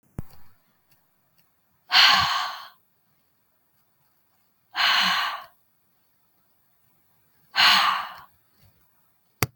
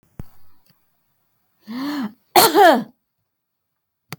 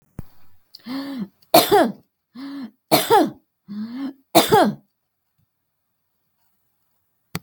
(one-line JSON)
{"exhalation_length": "9.6 s", "exhalation_amplitude": 32768, "exhalation_signal_mean_std_ratio": 0.34, "cough_length": "4.2 s", "cough_amplitude": 32768, "cough_signal_mean_std_ratio": 0.32, "three_cough_length": "7.4 s", "three_cough_amplitude": 32768, "three_cough_signal_mean_std_ratio": 0.36, "survey_phase": "beta (2021-08-13 to 2022-03-07)", "age": "45-64", "gender": "Female", "wearing_mask": "No", "symptom_none": true, "smoker_status": "Never smoked", "respiratory_condition_asthma": false, "respiratory_condition_other": false, "recruitment_source": "REACT", "submission_delay": "3 days", "covid_test_result": "Negative", "covid_test_method": "RT-qPCR"}